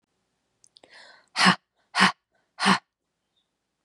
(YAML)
exhalation_length: 3.8 s
exhalation_amplitude: 26971
exhalation_signal_mean_std_ratio: 0.28
survey_phase: beta (2021-08-13 to 2022-03-07)
age: 18-44
gender: Female
wearing_mask: 'No'
symptom_none: true
smoker_status: Prefer not to say
respiratory_condition_asthma: false
respiratory_condition_other: false
recruitment_source: REACT
submission_delay: 0 days
covid_test_result: Negative
covid_test_method: RT-qPCR
influenza_a_test_result: Negative
influenza_b_test_result: Negative